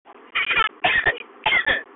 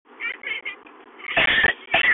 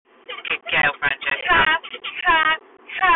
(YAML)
three_cough_length: 2.0 s
three_cough_amplitude: 14138
three_cough_signal_mean_std_ratio: 0.66
cough_length: 2.1 s
cough_amplitude: 14717
cough_signal_mean_std_ratio: 0.6
exhalation_length: 3.2 s
exhalation_amplitude: 17913
exhalation_signal_mean_std_ratio: 0.66
survey_phase: beta (2021-08-13 to 2022-03-07)
age: 18-44
gender: Female
wearing_mask: 'No'
symptom_cough_any: true
smoker_status: Current smoker (11 or more cigarettes per day)
respiratory_condition_asthma: true
respiratory_condition_other: false
recruitment_source: REACT
submission_delay: 3 days
covid_test_result: Negative
covid_test_method: RT-qPCR
influenza_a_test_result: Negative
influenza_b_test_result: Negative